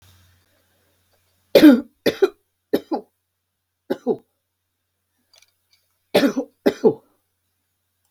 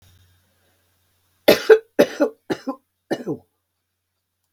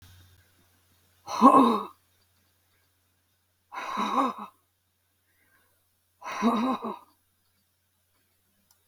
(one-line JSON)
{"three_cough_length": "8.1 s", "three_cough_amplitude": 32768, "three_cough_signal_mean_std_ratio": 0.25, "cough_length": "4.5 s", "cough_amplitude": 32768, "cough_signal_mean_std_ratio": 0.26, "exhalation_length": "8.9 s", "exhalation_amplitude": 21685, "exhalation_signal_mean_std_ratio": 0.3, "survey_phase": "beta (2021-08-13 to 2022-03-07)", "age": "65+", "gender": "Female", "wearing_mask": "No", "symptom_cough_any": true, "symptom_shortness_of_breath": true, "symptom_fatigue": true, "smoker_status": "Never smoked", "respiratory_condition_asthma": true, "respiratory_condition_other": false, "recruitment_source": "REACT", "submission_delay": "1 day", "covid_test_result": "Negative", "covid_test_method": "RT-qPCR", "influenza_a_test_result": "Negative", "influenza_b_test_result": "Negative"}